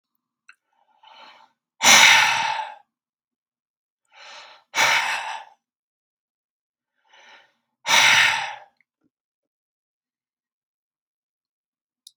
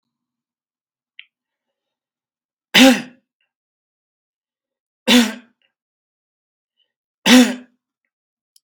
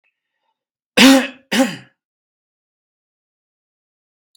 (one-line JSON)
{"exhalation_length": "12.2 s", "exhalation_amplitude": 32757, "exhalation_signal_mean_std_ratio": 0.3, "three_cough_length": "8.6 s", "three_cough_amplitude": 32768, "three_cough_signal_mean_std_ratio": 0.23, "cough_length": "4.4 s", "cough_amplitude": 32768, "cough_signal_mean_std_ratio": 0.25, "survey_phase": "beta (2021-08-13 to 2022-03-07)", "age": "45-64", "gender": "Male", "wearing_mask": "No", "symptom_none": true, "smoker_status": "Ex-smoker", "respiratory_condition_asthma": false, "respiratory_condition_other": false, "recruitment_source": "REACT", "submission_delay": "1 day", "covid_test_result": "Negative", "covid_test_method": "RT-qPCR"}